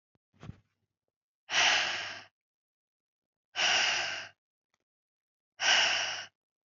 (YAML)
exhalation_length: 6.7 s
exhalation_amplitude: 8002
exhalation_signal_mean_std_ratio: 0.42
survey_phase: alpha (2021-03-01 to 2021-08-12)
age: 18-44
gender: Female
wearing_mask: 'No'
symptom_none: true
smoker_status: Ex-smoker
respiratory_condition_asthma: false
respiratory_condition_other: false
recruitment_source: REACT
submission_delay: 3 days
covid_test_result: Negative
covid_test_method: RT-qPCR